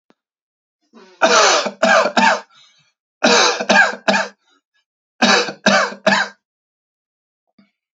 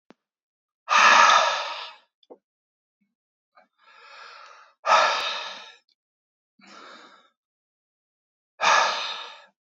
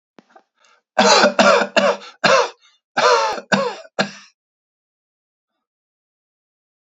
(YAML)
three_cough_length: 7.9 s
three_cough_amplitude: 29114
three_cough_signal_mean_std_ratio: 0.47
exhalation_length: 9.7 s
exhalation_amplitude: 23011
exhalation_signal_mean_std_ratio: 0.35
cough_length: 6.8 s
cough_amplitude: 32768
cough_signal_mean_std_ratio: 0.41
survey_phase: beta (2021-08-13 to 2022-03-07)
age: 18-44
gender: Male
wearing_mask: 'No'
symptom_none: true
smoker_status: Never smoked
respiratory_condition_asthma: false
respiratory_condition_other: false
recruitment_source: REACT
submission_delay: 3 days
covid_test_result: Negative
covid_test_method: RT-qPCR
influenza_a_test_result: Negative
influenza_b_test_result: Negative